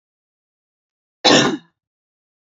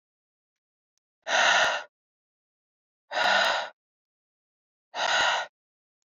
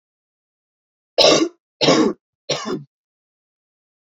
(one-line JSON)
{"cough_length": "2.5 s", "cough_amplitude": 30811, "cough_signal_mean_std_ratio": 0.27, "exhalation_length": "6.1 s", "exhalation_amplitude": 12767, "exhalation_signal_mean_std_ratio": 0.41, "three_cough_length": "4.1 s", "three_cough_amplitude": 30349, "three_cough_signal_mean_std_ratio": 0.35, "survey_phase": "beta (2021-08-13 to 2022-03-07)", "age": "18-44", "gender": "Female", "wearing_mask": "No", "symptom_none": true, "smoker_status": "Never smoked", "respiratory_condition_asthma": false, "respiratory_condition_other": false, "recruitment_source": "REACT", "submission_delay": "1 day", "covid_test_result": "Negative", "covid_test_method": "RT-qPCR"}